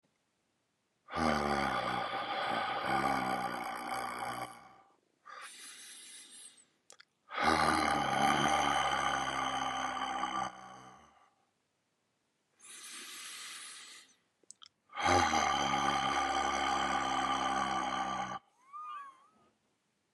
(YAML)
exhalation_length: 20.1 s
exhalation_amplitude: 7003
exhalation_signal_mean_std_ratio: 0.66
survey_phase: beta (2021-08-13 to 2022-03-07)
age: 45-64
gender: Male
wearing_mask: 'No'
symptom_cough_any: true
symptom_sore_throat: true
symptom_diarrhoea: true
symptom_fatigue: true
symptom_headache: true
symptom_change_to_sense_of_smell_or_taste: true
symptom_onset: 2 days
smoker_status: Current smoker (e-cigarettes or vapes only)
respiratory_condition_asthma: false
respiratory_condition_other: false
recruitment_source: Test and Trace
submission_delay: 1 day
covid_test_result: Positive
covid_test_method: ePCR